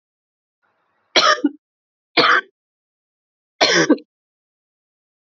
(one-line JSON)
{"three_cough_length": "5.3 s", "three_cough_amplitude": 29839, "three_cough_signal_mean_std_ratio": 0.32, "survey_phase": "beta (2021-08-13 to 2022-03-07)", "age": "18-44", "gender": "Female", "wearing_mask": "No", "symptom_cough_any": true, "symptom_new_continuous_cough": true, "symptom_runny_or_blocked_nose": true, "smoker_status": "Never smoked", "respiratory_condition_asthma": false, "respiratory_condition_other": false, "recruitment_source": "Test and Trace", "submission_delay": "2 days", "covid_test_result": "Positive", "covid_test_method": "RT-qPCR", "covid_ct_value": 23.0, "covid_ct_gene": "N gene"}